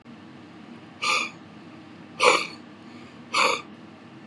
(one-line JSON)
{"exhalation_length": "4.3 s", "exhalation_amplitude": 27362, "exhalation_signal_mean_std_ratio": 0.43, "survey_phase": "beta (2021-08-13 to 2022-03-07)", "age": "45-64", "gender": "Male", "wearing_mask": "No", "symptom_none": true, "smoker_status": "Ex-smoker", "respiratory_condition_asthma": false, "respiratory_condition_other": true, "recruitment_source": "REACT", "submission_delay": "1 day", "covid_test_result": "Negative", "covid_test_method": "RT-qPCR"}